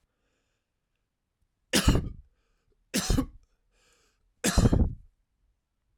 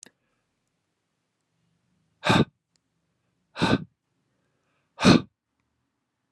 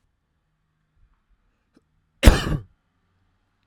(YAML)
three_cough_length: 6.0 s
three_cough_amplitude: 12116
three_cough_signal_mean_std_ratio: 0.32
exhalation_length: 6.3 s
exhalation_amplitude: 24576
exhalation_signal_mean_std_ratio: 0.22
cough_length: 3.7 s
cough_amplitude: 32768
cough_signal_mean_std_ratio: 0.18
survey_phase: alpha (2021-03-01 to 2021-08-12)
age: 45-64
gender: Male
wearing_mask: 'No'
symptom_none: true
smoker_status: Never smoked
respiratory_condition_asthma: false
respiratory_condition_other: false
recruitment_source: REACT
submission_delay: 1 day
covid_test_result: Negative
covid_test_method: RT-qPCR